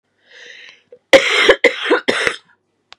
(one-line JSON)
{"cough_length": "3.0 s", "cough_amplitude": 32768, "cough_signal_mean_std_ratio": 0.42, "survey_phase": "beta (2021-08-13 to 2022-03-07)", "age": "18-44", "gender": "Female", "wearing_mask": "No", "symptom_cough_any": true, "symptom_runny_or_blocked_nose": true, "symptom_shortness_of_breath": true, "symptom_fatigue": true, "symptom_headache": true, "symptom_onset": "3 days", "smoker_status": "Never smoked", "respiratory_condition_asthma": false, "respiratory_condition_other": false, "recruitment_source": "Test and Trace", "submission_delay": "2 days", "covid_test_result": "Positive", "covid_test_method": "RT-qPCR"}